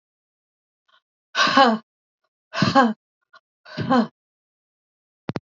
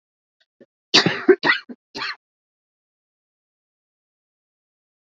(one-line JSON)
{"exhalation_length": "5.5 s", "exhalation_amplitude": 26894, "exhalation_signal_mean_std_ratio": 0.33, "cough_length": "5.0 s", "cough_amplitude": 30544, "cough_signal_mean_std_ratio": 0.23, "survey_phase": "beta (2021-08-13 to 2022-03-07)", "age": "45-64", "gender": "Female", "wearing_mask": "No", "symptom_cough_any": true, "symptom_fever_high_temperature": true, "symptom_onset": "4 days", "smoker_status": "Never smoked", "respiratory_condition_asthma": false, "respiratory_condition_other": false, "recruitment_source": "Test and Trace", "submission_delay": "2 days", "covid_test_result": "Negative", "covid_test_method": "RT-qPCR"}